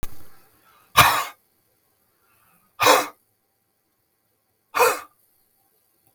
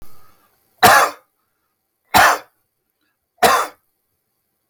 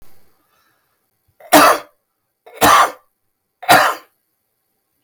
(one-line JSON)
{"exhalation_length": "6.1 s", "exhalation_amplitude": 32768, "exhalation_signal_mean_std_ratio": 0.29, "three_cough_length": "4.7 s", "three_cough_amplitude": 32768, "three_cough_signal_mean_std_ratio": 0.33, "cough_length": "5.0 s", "cough_amplitude": 32767, "cough_signal_mean_std_ratio": 0.34, "survey_phase": "beta (2021-08-13 to 2022-03-07)", "age": "65+", "gender": "Male", "wearing_mask": "No", "symptom_none": true, "smoker_status": "Ex-smoker", "respiratory_condition_asthma": true, "respiratory_condition_other": false, "recruitment_source": "REACT", "submission_delay": "3 days", "covid_test_result": "Negative", "covid_test_method": "RT-qPCR", "influenza_a_test_result": "Negative", "influenza_b_test_result": "Negative"}